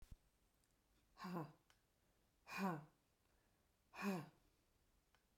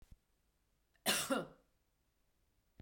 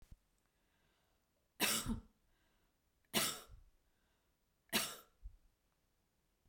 exhalation_length: 5.4 s
exhalation_amplitude: 847
exhalation_signal_mean_std_ratio: 0.36
cough_length: 2.8 s
cough_amplitude: 3354
cough_signal_mean_std_ratio: 0.3
three_cough_length: 6.5 s
three_cough_amplitude: 3102
three_cough_signal_mean_std_ratio: 0.3
survey_phase: beta (2021-08-13 to 2022-03-07)
age: 65+
gender: Female
wearing_mask: 'No'
symptom_none: true
smoker_status: Ex-smoker
respiratory_condition_asthma: false
respiratory_condition_other: false
recruitment_source: REACT
submission_delay: 2 days
covid_test_result: Negative
covid_test_method: RT-qPCR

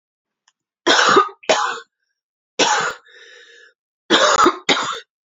three_cough_length: 5.3 s
three_cough_amplitude: 29818
three_cough_signal_mean_std_ratio: 0.46
survey_phase: beta (2021-08-13 to 2022-03-07)
age: 18-44
gender: Female
wearing_mask: 'No'
symptom_cough_any: true
symptom_runny_or_blocked_nose: true
symptom_sore_throat: true
symptom_fatigue: true
symptom_headache: true
symptom_onset: 4 days
smoker_status: Never smoked
respiratory_condition_asthma: false
respiratory_condition_other: false
recruitment_source: Test and Trace
submission_delay: 1 day
covid_test_result: Positive
covid_test_method: ePCR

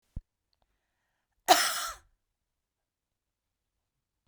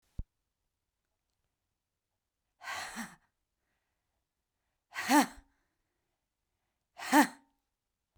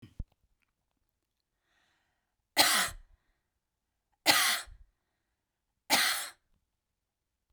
cough_length: 4.3 s
cough_amplitude: 18533
cough_signal_mean_std_ratio: 0.2
exhalation_length: 8.2 s
exhalation_amplitude: 8962
exhalation_signal_mean_std_ratio: 0.21
three_cough_length: 7.5 s
three_cough_amplitude: 11864
three_cough_signal_mean_std_ratio: 0.29
survey_phase: beta (2021-08-13 to 2022-03-07)
age: 45-64
gender: Female
wearing_mask: 'No'
symptom_none: true
smoker_status: Ex-smoker
respiratory_condition_asthma: false
respiratory_condition_other: false
recruitment_source: REACT
submission_delay: 1 day
covid_test_result: Negative
covid_test_method: RT-qPCR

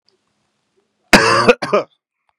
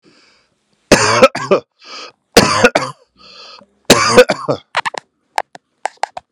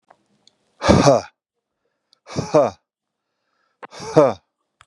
cough_length: 2.4 s
cough_amplitude: 32768
cough_signal_mean_std_ratio: 0.37
three_cough_length: 6.3 s
three_cough_amplitude: 32768
three_cough_signal_mean_std_ratio: 0.39
exhalation_length: 4.9 s
exhalation_amplitude: 32768
exhalation_signal_mean_std_ratio: 0.32
survey_phase: beta (2021-08-13 to 2022-03-07)
age: 45-64
gender: Male
wearing_mask: 'No'
symptom_none: true
smoker_status: Ex-smoker
respiratory_condition_asthma: false
respiratory_condition_other: false
recruitment_source: REACT
submission_delay: 1 day
covid_test_result: Negative
covid_test_method: RT-qPCR
influenza_a_test_result: Negative
influenza_b_test_result: Negative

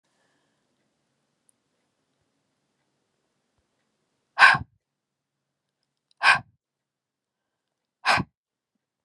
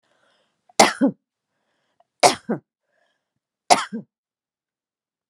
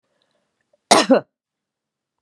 exhalation_length: 9.0 s
exhalation_amplitude: 27706
exhalation_signal_mean_std_ratio: 0.17
three_cough_length: 5.3 s
three_cough_amplitude: 32767
three_cough_signal_mean_std_ratio: 0.23
cough_length: 2.2 s
cough_amplitude: 32768
cough_signal_mean_std_ratio: 0.25
survey_phase: beta (2021-08-13 to 2022-03-07)
age: 45-64
gender: Female
wearing_mask: 'No'
symptom_none: true
smoker_status: Never smoked
respiratory_condition_asthma: false
respiratory_condition_other: false
recruitment_source: REACT
submission_delay: 1 day
covid_test_result: Negative
covid_test_method: RT-qPCR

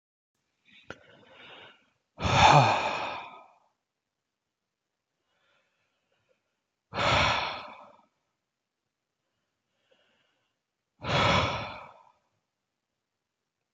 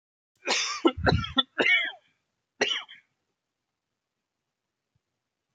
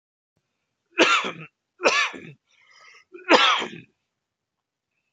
exhalation_length: 13.7 s
exhalation_amplitude: 17578
exhalation_signal_mean_std_ratio: 0.3
cough_length: 5.5 s
cough_amplitude: 18148
cough_signal_mean_std_ratio: 0.36
three_cough_length: 5.1 s
three_cough_amplitude: 27843
three_cough_signal_mean_std_ratio: 0.34
survey_phase: alpha (2021-03-01 to 2021-08-12)
age: 18-44
gender: Male
wearing_mask: 'No'
symptom_none: true
smoker_status: Ex-smoker
respiratory_condition_asthma: false
respiratory_condition_other: false
recruitment_source: REACT
submission_delay: 2 days
covid_test_result: Negative
covid_test_method: RT-qPCR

